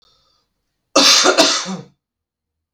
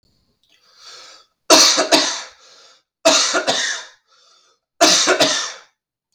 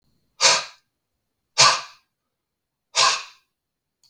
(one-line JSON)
{"cough_length": "2.7 s", "cough_amplitude": 32768, "cough_signal_mean_std_ratio": 0.42, "three_cough_length": "6.1 s", "three_cough_amplitude": 32768, "three_cough_signal_mean_std_ratio": 0.46, "exhalation_length": "4.1 s", "exhalation_amplitude": 32154, "exhalation_signal_mean_std_ratio": 0.31, "survey_phase": "beta (2021-08-13 to 2022-03-07)", "age": "18-44", "gender": "Male", "wearing_mask": "No", "symptom_cough_any": true, "symptom_runny_or_blocked_nose": true, "symptom_sore_throat": true, "symptom_fatigue": true, "symptom_headache": true, "smoker_status": "Never smoked", "respiratory_condition_asthma": true, "respiratory_condition_other": false, "recruitment_source": "Test and Trace", "submission_delay": "1 day", "covid_test_result": "Positive", "covid_test_method": "RT-qPCR", "covid_ct_value": 20.3, "covid_ct_gene": "ORF1ab gene", "covid_ct_mean": 23.3, "covid_viral_load": "23000 copies/ml", "covid_viral_load_category": "Low viral load (10K-1M copies/ml)"}